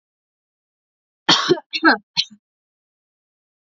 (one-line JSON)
{"cough_length": "3.8 s", "cough_amplitude": 29425, "cough_signal_mean_std_ratio": 0.27, "survey_phase": "alpha (2021-03-01 to 2021-08-12)", "age": "18-44", "gender": "Female", "wearing_mask": "No", "symptom_headache": true, "smoker_status": "Never smoked", "respiratory_condition_asthma": false, "respiratory_condition_other": false, "recruitment_source": "Test and Trace", "submission_delay": "2 days", "covid_test_result": "Positive", "covid_test_method": "RT-qPCR"}